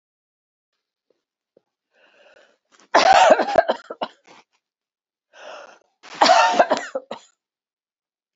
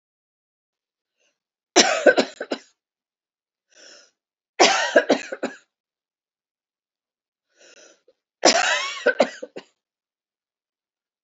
cough_length: 8.4 s
cough_amplitude: 28060
cough_signal_mean_std_ratio: 0.31
three_cough_length: 11.2 s
three_cough_amplitude: 32767
three_cough_signal_mean_std_ratio: 0.28
survey_phase: beta (2021-08-13 to 2022-03-07)
age: 65+
gender: Female
wearing_mask: 'No'
symptom_cough_any: true
symptom_runny_or_blocked_nose: true
symptom_onset: 12 days
smoker_status: Never smoked
respiratory_condition_asthma: false
respiratory_condition_other: false
recruitment_source: REACT
submission_delay: 1 day
covid_test_result: Negative
covid_test_method: RT-qPCR
influenza_a_test_result: Unknown/Void
influenza_b_test_result: Unknown/Void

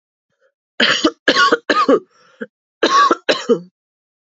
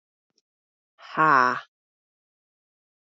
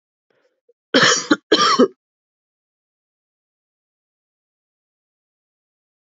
three_cough_length: 4.4 s
three_cough_amplitude: 30164
three_cough_signal_mean_std_ratio: 0.47
exhalation_length: 3.2 s
exhalation_amplitude: 17872
exhalation_signal_mean_std_ratio: 0.26
cough_length: 6.1 s
cough_amplitude: 28907
cough_signal_mean_std_ratio: 0.26
survey_phase: alpha (2021-03-01 to 2021-08-12)
age: 18-44
gender: Female
wearing_mask: 'No'
symptom_cough_any: true
symptom_fever_high_temperature: true
symptom_headache: true
symptom_change_to_sense_of_smell_or_taste: true
symptom_loss_of_taste: true
symptom_onset: 5 days
smoker_status: Never smoked
respiratory_condition_asthma: false
respiratory_condition_other: false
recruitment_source: Test and Trace
submission_delay: 1 day
covid_test_result: Positive
covid_test_method: ePCR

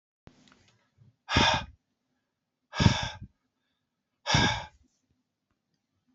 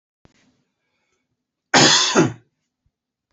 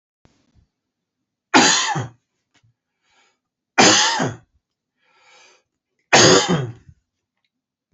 exhalation_length: 6.1 s
exhalation_amplitude: 15920
exhalation_signal_mean_std_ratio: 0.3
cough_length: 3.3 s
cough_amplitude: 30604
cough_signal_mean_std_ratio: 0.33
three_cough_length: 7.9 s
three_cough_amplitude: 32768
three_cough_signal_mean_std_ratio: 0.34
survey_phase: beta (2021-08-13 to 2022-03-07)
age: 45-64
gender: Male
wearing_mask: 'No'
symptom_runny_or_blocked_nose: true
symptom_sore_throat: true
smoker_status: Never smoked
respiratory_condition_asthma: false
respiratory_condition_other: false
recruitment_source: Test and Trace
submission_delay: 1 day
covid_test_result: Positive
covid_test_method: RT-qPCR
covid_ct_value: 31.8
covid_ct_gene: ORF1ab gene
covid_ct_mean: 32.7
covid_viral_load: 19 copies/ml
covid_viral_load_category: Minimal viral load (< 10K copies/ml)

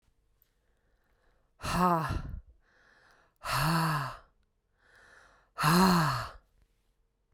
exhalation_length: 7.3 s
exhalation_amplitude: 7849
exhalation_signal_mean_std_ratio: 0.43
survey_phase: beta (2021-08-13 to 2022-03-07)
age: 45-64
gender: Female
wearing_mask: 'No'
symptom_cough_any: true
symptom_sore_throat: true
symptom_fatigue: true
symptom_headache: true
symptom_change_to_sense_of_smell_or_taste: true
symptom_onset: 7 days
smoker_status: Ex-smoker
respiratory_condition_asthma: false
respiratory_condition_other: false
recruitment_source: Test and Trace
submission_delay: 2 days
covid_test_result: Positive
covid_test_method: RT-qPCR
covid_ct_value: 17.5
covid_ct_gene: ORF1ab gene
covid_ct_mean: 17.7
covid_viral_load: 1600000 copies/ml
covid_viral_load_category: High viral load (>1M copies/ml)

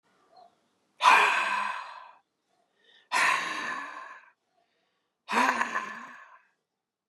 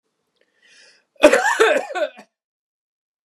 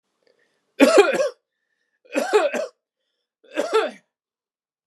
exhalation_length: 7.1 s
exhalation_amplitude: 14540
exhalation_signal_mean_std_ratio: 0.42
cough_length: 3.2 s
cough_amplitude: 32768
cough_signal_mean_std_ratio: 0.35
three_cough_length: 4.9 s
three_cough_amplitude: 32680
three_cough_signal_mean_std_ratio: 0.38
survey_phase: beta (2021-08-13 to 2022-03-07)
age: 18-44
gender: Male
wearing_mask: 'No'
symptom_none: true
smoker_status: Never smoked
respiratory_condition_asthma: false
respiratory_condition_other: false
recruitment_source: REACT
submission_delay: 2 days
covid_test_result: Negative
covid_test_method: RT-qPCR
influenza_a_test_result: Negative
influenza_b_test_result: Negative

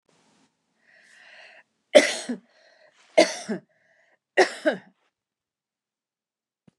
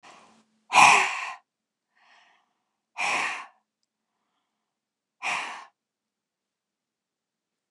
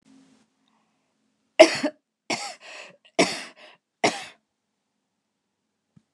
three_cough_length: 6.8 s
three_cough_amplitude: 29159
three_cough_signal_mean_std_ratio: 0.22
exhalation_length: 7.7 s
exhalation_amplitude: 27194
exhalation_signal_mean_std_ratio: 0.26
cough_length: 6.1 s
cough_amplitude: 29204
cough_signal_mean_std_ratio: 0.21
survey_phase: beta (2021-08-13 to 2022-03-07)
age: 65+
gender: Female
wearing_mask: 'No'
symptom_fatigue: true
smoker_status: Ex-smoker
respiratory_condition_asthma: false
respiratory_condition_other: false
recruitment_source: REACT
submission_delay: 2 days
covid_test_result: Negative
covid_test_method: RT-qPCR
influenza_a_test_result: Negative
influenza_b_test_result: Negative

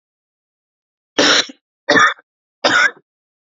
three_cough_length: 3.5 s
three_cough_amplitude: 32768
three_cough_signal_mean_std_ratio: 0.38
survey_phase: beta (2021-08-13 to 2022-03-07)
age: 45-64
gender: Male
wearing_mask: 'No'
symptom_diarrhoea: true
symptom_fatigue: true
symptom_fever_high_temperature: true
smoker_status: Never smoked
respiratory_condition_asthma: true
respiratory_condition_other: false
recruitment_source: Test and Trace
submission_delay: 2 days
covid_test_result: Positive
covid_test_method: RT-qPCR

